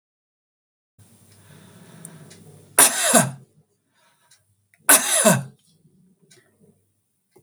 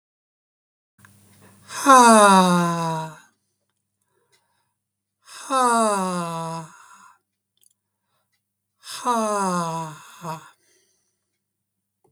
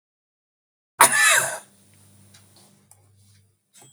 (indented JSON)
{
  "three_cough_length": "7.4 s",
  "three_cough_amplitude": 32768,
  "three_cough_signal_mean_std_ratio": 0.28,
  "exhalation_length": "12.1 s",
  "exhalation_amplitude": 32766,
  "exhalation_signal_mean_std_ratio": 0.37,
  "cough_length": "3.9 s",
  "cough_amplitude": 32768,
  "cough_signal_mean_std_ratio": 0.28,
  "survey_phase": "beta (2021-08-13 to 2022-03-07)",
  "age": "65+",
  "gender": "Male",
  "wearing_mask": "No",
  "symptom_none": true,
  "smoker_status": "Never smoked",
  "respiratory_condition_asthma": false,
  "respiratory_condition_other": false,
  "recruitment_source": "REACT",
  "submission_delay": "2 days",
  "covid_test_result": "Negative",
  "covid_test_method": "RT-qPCR",
  "influenza_a_test_result": "Negative",
  "influenza_b_test_result": "Negative"
}